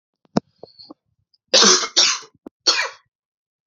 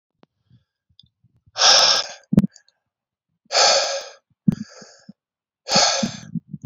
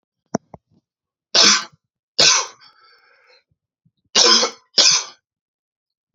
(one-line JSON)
{"cough_length": "3.7 s", "cough_amplitude": 32768, "cough_signal_mean_std_ratio": 0.36, "exhalation_length": "6.7 s", "exhalation_amplitude": 32453, "exhalation_signal_mean_std_ratio": 0.39, "three_cough_length": "6.1 s", "three_cough_amplitude": 32768, "three_cough_signal_mean_std_ratio": 0.35, "survey_phase": "beta (2021-08-13 to 2022-03-07)", "age": "18-44", "gender": "Male", "wearing_mask": "No", "symptom_cough_any": true, "symptom_runny_or_blocked_nose": true, "symptom_sore_throat": true, "symptom_fever_high_temperature": true, "symptom_change_to_sense_of_smell_or_taste": true, "symptom_loss_of_taste": true, "smoker_status": "Never smoked", "respiratory_condition_asthma": false, "respiratory_condition_other": false, "recruitment_source": "Test and Trace", "submission_delay": "2 days", "covid_test_result": "Positive", "covid_test_method": "LFT"}